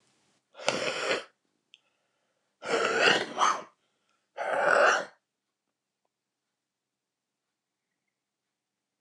{
  "exhalation_length": "9.0 s",
  "exhalation_amplitude": 17161,
  "exhalation_signal_mean_std_ratio": 0.36,
  "survey_phase": "beta (2021-08-13 to 2022-03-07)",
  "age": "45-64",
  "gender": "Male",
  "wearing_mask": "No",
  "symptom_cough_any": true,
  "symptom_shortness_of_breath": true,
  "symptom_onset": "9 days",
  "smoker_status": "Never smoked",
  "respiratory_condition_asthma": true,
  "respiratory_condition_other": false,
  "recruitment_source": "REACT",
  "submission_delay": "1 day",
  "covid_test_result": "Negative",
  "covid_test_method": "RT-qPCR"
}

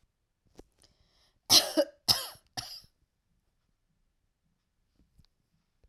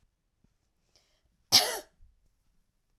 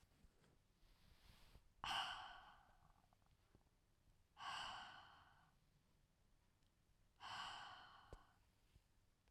{
  "three_cough_length": "5.9 s",
  "three_cough_amplitude": 14911,
  "three_cough_signal_mean_std_ratio": 0.2,
  "cough_length": "3.0 s",
  "cough_amplitude": 18906,
  "cough_signal_mean_std_ratio": 0.19,
  "exhalation_length": "9.3 s",
  "exhalation_amplitude": 736,
  "exhalation_signal_mean_std_ratio": 0.44,
  "survey_phase": "alpha (2021-03-01 to 2021-08-12)",
  "age": "45-64",
  "gender": "Female",
  "wearing_mask": "No",
  "symptom_none": true,
  "smoker_status": "Never smoked",
  "respiratory_condition_asthma": false,
  "respiratory_condition_other": false,
  "recruitment_source": "REACT",
  "submission_delay": "1 day",
  "covid_test_result": "Negative",
  "covid_test_method": "RT-qPCR"
}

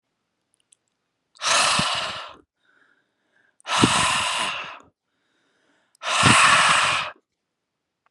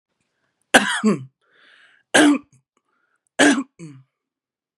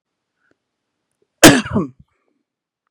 {
  "exhalation_length": "8.1 s",
  "exhalation_amplitude": 27397,
  "exhalation_signal_mean_std_ratio": 0.47,
  "three_cough_length": "4.8 s",
  "three_cough_amplitude": 32767,
  "three_cough_signal_mean_std_ratio": 0.33,
  "cough_length": "2.9 s",
  "cough_amplitude": 32768,
  "cough_signal_mean_std_ratio": 0.23,
  "survey_phase": "beta (2021-08-13 to 2022-03-07)",
  "age": "18-44",
  "gender": "Male",
  "wearing_mask": "No",
  "symptom_none": true,
  "smoker_status": "Never smoked",
  "respiratory_condition_asthma": false,
  "respiratory_condition_other": false,
  "recruitment_source": "Test and Trace",
  "submission_delay": "2 days",
  "covid_test_result": "Positive",
  "covid_test_method": "RT-qPCR"
}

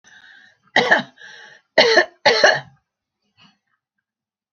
{
  "three_cough_length": "4.5 s",
  "three_cough_amplitude": 30325,
  "three_cough_signal_mean_std_ratio": 0.35,
  "survey_phase": "beta (2021-08-13 to 2022-03-07)",
  "age": "65+",
  "gender": "Female",
  "wearing_mask": "No",
  "symptom_none": true,
  "smoker_status": "Ex-smoker",
  "respiratory_condition_asthma": false,
  "respiratory_condition_other": false,
  "recruitment_source": "REACT",
  "submission_delay": "1 day",
  "covid_test_result": "Negative",
  "covid_test_method": "RT-qPCR"
}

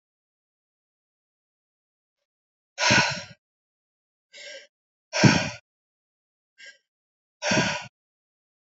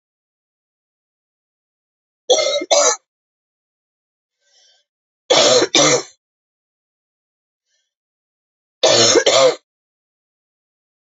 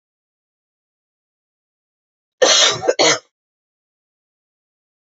{
  "exhalation_length": "8.7 s",
  "exhalation_amplitude": 23639,
  "exhalation_signal_mean_std_ratio": 0.27,
  "three_cough_length": "11.1 s",
  "three_cough_amplitude": 32767,
  "three_cough_signal_mean_std_ratio": 0.33,
  "cough_length": "5.1 s",
  "cough_amplitude": 31009,
  "cough_signal_mean_std_ratio": 0.28,
  "survey_phase": "alpha (2021-03-01 to 2021-08-12)",
  "age": "45-64",
  "gender": "Female",
  "wearing_mask": "No",
  "symptom_cough_any": true,
  "symptom_fatigue": true,
  "symptom_headache": true,
  "symptom_onset": "2 days",
  "smoker_status": "Ex-smoker",
  "respiratory_condition_asthma": false,
  "respiratory_condition_other": false,
  "recruitment_source": "Test and Trace",
  "submission_delay": "2 days",
  "covid_test_result": "Positive",
  "covid_test_method": "RT-qPCR",
  "covid_ct_value": 28.0,
  "covid_ct_gene": "ORF1ab gene",
  "covid_ct_mean": 28.6,
  "covid_viral_load": "420 copies/ml",
  "covid_viral_load_category": "Minimal viral load (< 10K copies/ml)"
}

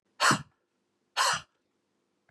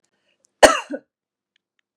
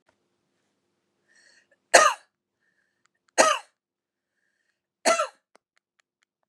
{
  "exhalation_length": "2.3 s",
  "exhalation_amplitude": 10304,
  "exhalation_signal_mean_std_ratio": 0.33,
  "cough_length": "2.0 s",
  "cough_amplitude": 32768,
  "cough_signal_mean_std_ratio": 0.2,
  "three_cough_length": "6.5 s",
  "three_cough_amplitude": 31982,
  "three_cough_signal_mean_std_ratio": 0.22,
  "survey_phase": "beta (2021-08-13 to 2022-03-07)",
  "age": "45-64",
  "gender": "Female",
  "wearing_mask": "No",
  "symptom_none": true,
  "smoker_status": "Ex-smoker",
  "respiratory_condition_asthma": true,
  "respiratory_condition_other": false,
  "recruitment_source": "REACT",
  "submission_delay": "3 days",
  "covid_test_result": "Negative",
  "covid_test_method": "RT-qPCR",
  "influenza_a_test_result": "Negative",
  "influenza_b_test_result": "Negative"
}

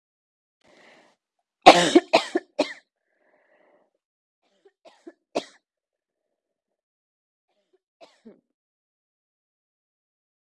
{
  "three_cough_length": "10.4 s",
  "three_cough_amplitude": 32768,
  "three_cough_signal_mean_std_ratio": 0.15,
  "survey_phase": "beta (2021-08-13 to 2022-03-07)",
  "age": "45-64",
  "gender": "Female",
  "wearing_mask": "No",
  "symptom_cough_any": true,
  "symptom_new_continuous_cough": true,
  "symptom_runny_or_blocked_nose": true,
  "symptom_sore_throat": true,
  "symptom_onset": "7 days",
  "smoker_status": "Ex-smoker",
  "respiratory_condition_asthma": false,
  "respiratory_condition_other": false,
  "recruitment_source": "Test and Trace",
  "submission_delay": "2 days",
  "covid_test_result": "Positive",
  "covid_test_method": "RT-qPCR",
  "covid_ct_value": 24.1,
  "covid_ct_gene": "N gene"
}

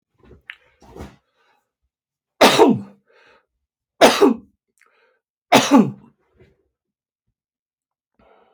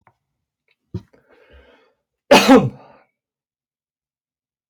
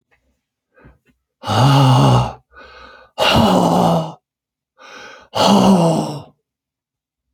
{
  "three_cough_length": "8.5 s",
  "three_cough_amplitude": 30184,
  "three_cough_signal_mean_std_ratio": 0.27,
  "cough_length": "4.7 s",
  "cough_amplitude": 30079,
  "cough_signal_mean_std_ratio": 0.22,
  "exhalation_length": "7.3 s",
  "exhalation_amplitude": 31298,
  "exhalation_signal_mean_std_ratio": 0.52,
  "survey_phase": "beta (2021-08-13 to 2022-03-07)",
  "age": "65+",
  "gender": "Male",
  "wearing_mask": "No",
  "symptom_none": true,
  "smoker_status": "Never smoked",
  "respiratory_condition_asthma": false,
  "respiratory_condition_other": false,
  "recruitment_source": "REACT",
  "submission_delay": "2 days",
  "covid_test_result": "Negative",
  "covid_test_method": "RT-qPCR"
}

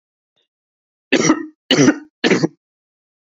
{
  "three_cough_length": "3.2 s",
  "three_cough_amplitude": 29194,
  "three_cough_signal_mean_std_ratio": 0.38,
  "survey_phase": "beta (2021-08-13 to 2022-03-07)",
  "age": "18-44",
  "gender": "Male",
  "wearing_mask": "No",
  "symptom_none": true,
  "smoker_status": "Never smoked",
  "respiratory_condition_asthma": true,
  "respiratory_condition_other": false,
  "recruitment_source": "REACT",
  "submission_delay": "3 days",
  "covid_test_result": "Negative",
  "covid_test_method": "RT-qPCR",
  "influenza_a_test_result": "Negative",
  "influenza_b_test_result": "Negative"
}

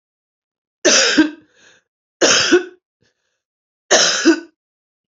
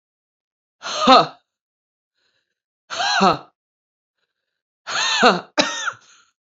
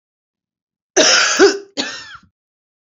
{
  "three_cough_length": "5.1 s",
  "three_cough_amplitude": 31904,
  "three_cough_signal_mean_std_ratio": 0.41,
  "exhalation_length": "6.5 s",
  "exhalation_amplitude": 32767,
  "exhalation_signal_mean_std_ratio": 0.35,
  "cough_length": "2.9 s",
  "cough_amplitude": 32768,
  "cough_signal_mean_std_ratio": 0.4,
  "survey_phase": "beta (2021-08-13 to 2022-03-07)",
  "age": "45-64",
  "gender": "Female",
  "wearing_mask": "No",
  "symptom_new_continuous_cough": true,
  "symptom_runny_or_blocked_nose": true,
  "symptom_sore_throat": true,
  "symptom_abdominal_pain": true,
  "symptom_fatigue": true,
  "symptom_fever_high_temperature": true,
  "symptom_headache": true,
  "symptom_other": true,
  "smoker_status": "Ex-smoker",
  "respiratory_condition_asthma": false,
  "respiratory_condition_other": false,
  "recruitment_source": "Test and Trace",
  "submission_delay": "4 days",
  "covid_test_result": "Negative",
  "covid_test_method": "RT-qPCR"
}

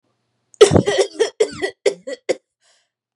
{
  "cough_length": "3.2 s",
  "cough_amplitude": 32768,
  "cough_signal_mean_std_ratio": 0.36,
  "survey_phase": "beta (2021-08-13 to 2022-03-07)",
  "age": "18-44",
  "gender": "Female",
  "wearing_mask": "No",
  "symptom_none": true,
  "smoker_status": "Never smoked",
  "respiratory_condition_asthma": false,
  "respiratory_condition_other": false,
  "recruitment_source": "Test and Trace",
  "submission_delay": "2 days",
  "covid_test_result": "Negative",
  "covid_test_method": "RT-qPCR"
}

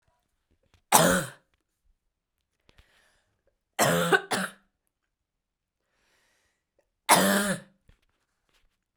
{
  "three_cough_length": "9.0 s",
  "three_cough_amplitude": 27733,
  "three_cough_signal_mean_std_ratio": 0.3,
  "survey_phase": "beta (2021-08-13 to 2022-03-07)",
  "age": "18-44",
  "gender": "Female",
  "wearing_mask": "No",
  "symptom_cough_any": true,
  "symptom_runny_or_blocked_nose": true,
  "symptom_shortness_of_breath": true,
  "symptom_fatigue": true,
  "symptom_other": true,
  "symptom_onset": "3 days",
  "smoker_status": "Never smoked",
  "respiratory_condition_asthma": true,
  "respiratory_condition_other": false,
  "recruitment_source": "Test and Trace",
  "submission_delay": "1 day",
  "covid_test_result": "Positive",
  "covid_test_method": "RT-qPCR",
  "covid_ct_value": 16.6,
  "covid_ct_gene": "ORF1ab gene",
  "covid_ct_mean": 17.0,
  "covid_viral_load": "2800000 copies/ml",
  "covid_viral_load_category": "High viral load (>1M copies/ml)"
}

